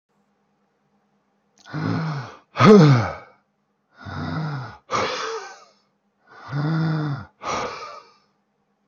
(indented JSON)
{
  "exhalation_length": "8.9 s",
  "exhalation_amplitude": 30012,
  "exhalation_signal_mean_std_ratio": 0.39,
  "survey_phase": "alpha (2021-03-01 to 2021-08-12)",
  "age": "18-44",
  "gender": "Male",
  "wearing_mask": "No",
  "symptom_none": true,
  "smoker_status": "Never smoked",
  "respiratory_condition_asthma": false,
  "respiratory_condition_other": false,
  "recruitment_source": "REACT",
  "submission_delay": "0 days",
  "covid_test_result": "Negative",
  "covid_test_method": "RT-qPCR"
}